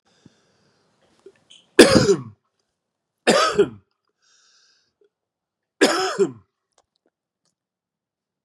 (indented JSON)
{
  "three_cough_length": "8.4 s",
  "three_cough_amplitude": 32768,
  "three_cough_signal_mean_std_ratio": 0.27,
  "survey_phase": "beta (2021-08-13 to 2022-03-07)",
  "age": "18-44",
  "gender": "Male",
  "wearing_mask": "No",
  "symptom_none": true,
  "smoker_status": "Ex-smoker",
  "respiratory_condition_asthma": false,
  "respiratory_condition_other": false,
  "recruitment_source": "REACT",
  "submission_delay": "4 days",
  "covid_test_result": "Negative",
  "covid_test_method": "RT-qPCR",
  "influenza_a_test_result": "Negative",
  "influenza_b_test_result": "Negative"
}